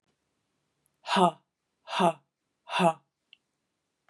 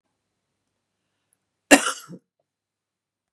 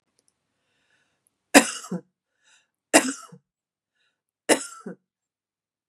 {"exhalation_length": "4.1 s", "exhalation_amplitude": 15157, "exhalation_signal_mean_std_ratio": 0.29, "cough_length": "3.3 s", "cough_amplitude": 32767, "cough_signal_mean_std_ratio": 0.15, "three_cough_length": "5.9 s", "three_cough_amplitude": 32768, "three_cough_signal_mean_std_ratio": 0.19, "survey_phase": "beta (2021-08-13 to 2022-03-07)", "age": "45-64", "gender": "Female", "wearing_mask": "No", "symptom_fatigue": true, "symptom_onset": "12 days", "smoker_status": "Never smoked", "respiratory_condition_asthma": false, "respiratory_condition_other": false, "recruitment_source": "REACT", "submission_delay": "1 day", "covid_test_result": "Negative", "covid_test_method": "RT-qPCR", "influenza_a_test_result": "Negative", "influenza_b_test_result": "Negative"}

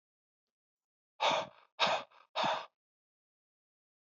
{"exhalation_length": "4.0 s", "exhalation_amplitude": 5375, "exhalation_signal_mean_std_ratio": 0.34, "survey_phase": "beta (2021-08-13 to 2022-03-07)", "age": "65+", "gender": "Male", "wearing_mask": "No", "symptom_cough_any": true, "symptom_runny_or_blocked_nose": true, "symptom_sore_throat": true, "symptom_onset": "4 days", "smoker_status": "Ex-smoker", "respiratory_condition_asthma": false, "respiratory_condition_other": false, "recruitment_source": "Test and Trace", "submission_delay": "1 day", "covid_test_result": "Positive", "covid_test_method": "RT-qPCR", "covid_ct_value": 18.6, "covid_ct_gene": "N gene"}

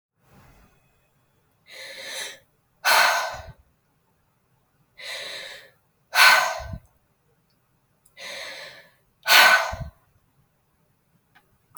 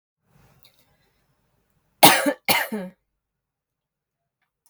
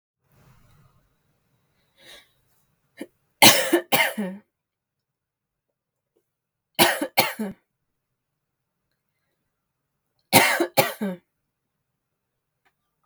{"exhalation_length": "11.8 s", "exhalation_amplitude": 28821, "exhalation_signal_mean_std_ratio": 0.3, "cough_length": "4.7 s", "cough_amplitude": 32768, "cough_signal_mean_std_ratio": 0.23, "three_cough_length": "13.1 s", "three_cough_amplitude": 32768, "three_cough_signal_mean_std_ratio": 0.25, "survey_phase": "beta (2021-08-13 to 2022-03-07)", "age": "18-44", "gender": "Female", "wearing_mask": "No", "symptom_none": true, "smoker_status": "Ex-smoker", "respiratory_condition_asthma": false, "respiratory_condition_other": false, "recruitment_source": "REACT", "submission_delay": "0 days", "covid_test_result": "Negative", "covid_test_method": "RT-qPCR"}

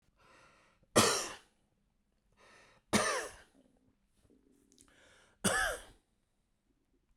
{"three_cough_length": "7.2 s", "three_cough_amplitude": 9287, "three_cough_signal_mean_std_ratio": 0.3, "survey_phase": "beta (2021-08-13 to 2022-03-07)", "age": "45-64", "gender": "Male", "wearing_mask": "No", "symptom_none": true, "smoker_status": "Current smoker (1 to 10 cigarettes per day)", "respiratory_condition_asthma": false, "respiratory_condition_other": false, "recruitment_source": "REACT", "submission_delay": "2 days", "covid_test_result": "Negative", "covid_test_method": "RT-qPCR", "influenza_a_test_result": "Negative", "influenza_b_test_result": "Negative"}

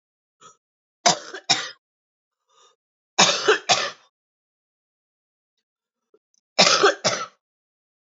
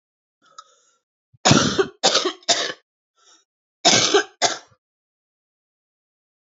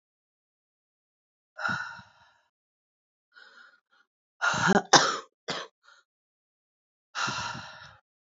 {"three_cough_length": "8.0 s", "three_cough_amplitude": 29338, "three_cough_signal_mean_std_ratio": 0.3, "cough_length": "6.5 s", "cough_amplitude": 27509, "cough_signal_mean_std_ratio": 0.35, "exhalation_length": "8.4 s", "exhalation_amplitude": 26058, "exhalation_signal_mean_std_ratio": 0.28, "survey_phase": "beta (2021-08-13 to 2022-03-07)", "age": "45-64", "gender": "Female", "wearing_mask": "No", "symptom_cough_any": true, "symptom_runny_or_blocked_nose": true, "symptom_abdominal_pain": true, "symptom_fatigue": true, "symptom_change_to_sense_of_smell_or_taste": true, "symptom_loss_of_taste": true, "symptom_onset": "7 days", "smoker_status": "Current smoker (1 to 10 cigarettes per day)", "respiratory_condition_asthma": false, "respiratory_condition_other": false, "recruitment_source": "Test and Trace", "submission_delay": "2 days", "covid_test_result": "Positive", "covid_test_method": "RT-qPCR", "covid_ct_value": 18.3, "covid_ct_gene": "ORF1ab gene"}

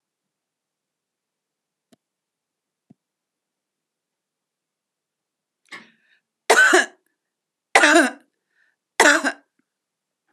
{"three_cough_length": "10.3 s", "three_cough_amplitude": 32767, "three_cough_signal_mean_std_ratio": 0.24, "survey_phase": "beta (2021-08-13 to 2022-03-07)", "age": "45-64", "gender": "Female", "wearing_mask": "No", "symptom_none": true, "smoker_status": "Never smoked", "respiratory_condition_asthma": false, "respiratory_condition_other": false, "recruitment_source": "REACT", "submission_delay": "2 days", "covid_test_result": "Negative", "covid_test_method": "RT-qPCR", "influenza_a_test_result": "Negative", "influenza_b_test_result": "Negative"}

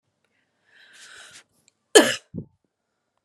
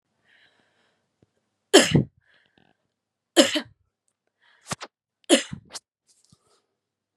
{"cough_length": "3.2 s", "cough_amplitude": 32767, "cough_signal_mean_std_ratio": 0.18, "three_cough_length": "7.2 s", "three_cough_amplitude": 32189, "three_cough_signal_mean_std_ratio": 0.21, "survey_phase": "beta (2021-08-13 to 2022-03-07)", "age": "18-44", "gender": "Female", "wearing_mask": "No", "symptom_none": true, "smoker_status": "Never smoked", "respiratory_condition_asthma": false, "respiratory_condition_other": false, "recruitment_source": "Test and Trace", "submission_delay": "-1 day", "covid_test_result": "Negative", "covid_test_method": "LFT"}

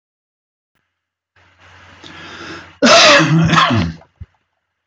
{"cough_length": "4.9 s", "cough_amplitude": 32268, "cough_signal_mean_std_ratio": 0.43, "survey_phase": "beta (2021-08-13 to 2022-03-07)", "age": "65+", "gender": "Male", "wearing_mask": "No", "symptom_none": true, "smoker_status": "Ex-smoker", "respiratory_condition_asthma": false, "respiratory_condition_other": false, "recruitment_source": "REACT", "submission_delay": "1 day", "covid_test_result": "Negative", "covid_test_method": "RT-qPCR"}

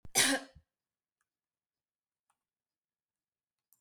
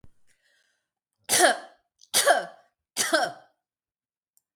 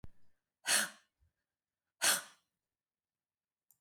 {"cough_length": "3.8 s", "cough_amplitude": 7826, "cough_signal_mean_std_ratio": 0.21, "three_cough_length": "4.6 s", "three_cough_amplitude": 17272, "three_cough_signal_mean_std_ratio": 0.34, "exhalation_length": "3.8 s", "exhalation_amplitude": 6740, "exhalation_signal_mean_std_ratio": 0.27, "survey_phase": "beta (2021-08-13 to 2022-03-07)", "age": "65+", "gender": "Female", "wearing_mask": "No", "symptom_none": true, "smoker_status": "Never smoked", "respiratory_condition_asthma": false, "respiratory_condition_other": false, "recruitment_source": "REACT", "submission_delay": "0 days", "covid_test_result": "Negative", "covid_test_method": "RT-qPCR"}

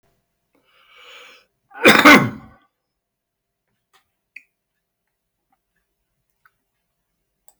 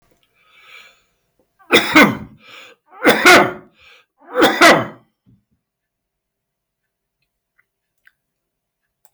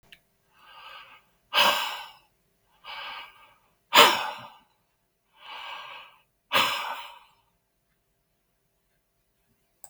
{"cough_length": "7.6 s", "cough_amplitude": 32768, "cough_signal_mean_std_ratio": 0.19, "three_cough_length": "9.1 s", "three_cough_amplitude": 32768, "three_cough_signal_mean_std_ratio": 0.31, "exhalation_length": "9.9 s", "exhalation_amplitude": 32768, "exhalation_signal_mean_std_ratio": 0.28, "survey_phase": "beta (2021-08-13 to 2022-03-07)", "age": "65+", "gender": "Male", "wearing_mask": "No", "symptom_none": true, "smoker_status": "Never smoked", "respiratory_condition_asthma": true, "respiratory_condition_other": false, "recruitment_source": "REACT", "submission_delay": "1 day", "covid_test_result": "Negative", "covid_test_method": "RT-qPCR", "influenza_a_test_result": "Unknown/Void", "influenza_b_test_result": "Unknown/Void"}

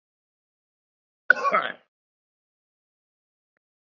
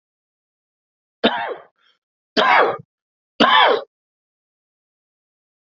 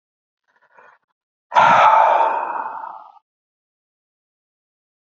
{"cough_length": "3.8 s", "cough_amplitude": 27325, "cough_signal_mean_std_ratio": 0.18, "three_cough_length": "5.6 s", "three_cough_amplitude": 29203, "three_cough_signal_mean_std_ratio": 0.34, "exhalation_length": "5.1 s", "exhalation_amplitude": 26494, "exhalation_signal_mean_std_ratio": 0.38, "survey_phase": "beta (2021-08-13 to 2022-03-07)", "age": "45-64", "gender": "Male", "wearing_mask": "No", "symptom_none": true, "smoker_status": "Current smoker (1 to 10 cigarettes per day)", "respiratory_condition_asthma": false, "respiratory_condition_other": false, "recruitment_source": "REACT", "submission_delay": "1 day", "covid_test_result": "Negative", "covid_test_method": "RT-qPCR", "influenza_a_test_result": "Negative", "influenza_b_test_result": "Negative"}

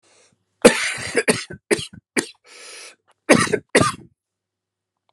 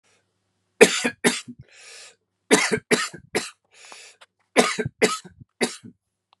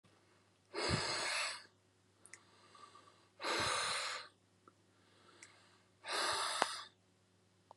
{"cough_length": "5.1 s", "cough_amplitude": 32768, "cough_signal_mean_std_ratio": 0.33, "three_cough_length": "6.4 s", "three_cough_amplitude": 32768, "three_cough_signal_mean_std_ratio": 0.33, "exhalation_length": "7.8 s", "exhalation_amplitude": 7983, "exhalation_signal_mean_std_ratio": 0.5, "survey_phase": "beta (2021-08-13 to 2022-03-07)", "age": "45-64", "gender": "Male", "wearing_mask": "No", "symptom_cough_any": true, "symptom_runny_or_blocked_nose": true, "symptom_shortness_of_breath": true, "symptom_sore_throat": true, "symptom_fatigue": true, "symptom_other": true, "symptom_onset": "3 days", "smoker_status": "Ex-smoker", "respiratory_condition_asthma": false, "respiratory_condition_other": false, "recruitment_source": "REACT", "submission_delay": "1 day", "covid_test_result": "Negative", "covid_test_method": "RT-qPCR"}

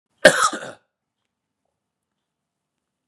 {"cough_length": "3.1 s", "cough_amplitude": 32768, "cough_signal_mean_std_ratio": 0.2, "survey_phase": "beta (2021-08-13 to 2022-03-07)", "age": "45-64", "gender": "Male", "wearing_mask": "No", "symptom_cough_any": true, "symptom_runny_or_blocked_nose": true, "symptom_sore_throat": true, "symptom_headache": true, "symptom_onset": "3 days", "smoker_status": "Ex-smoker", "respiratory_condition_asthma": false, "respiratory_condition_other": false, "recruitment_source": "Test and Trace", "submission_delay": "1 day", "covid_test_result": "Positive", "covid_test_method": "RT-qPCR", "covid_ct_value": 20.1, "covid_ct_gene": "N gene"}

